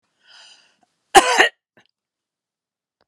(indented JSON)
{
  "cough_length": "3.1 s",
  "cough_amplitude": 32768,
  "cough_signal_mean_std_ratio": 0.22,
  "survey_phase": "alpha (2021-03-01 to 2021-08-12)",
  "age": "65+",
  "gender": "Female",
  "wearing_mask": "No",
  "symptom_none": true,
  "smoker_status": "Ex-smoker",
  "respiratory_condition_asthma": false,
  "respiratory_condition_other": false,
  "recruitment_source": "REACT",
  "submission_delay": "1 day",
  "covid_test_result": "Negative",
  "covid_test_method": "RT-qPCR"
}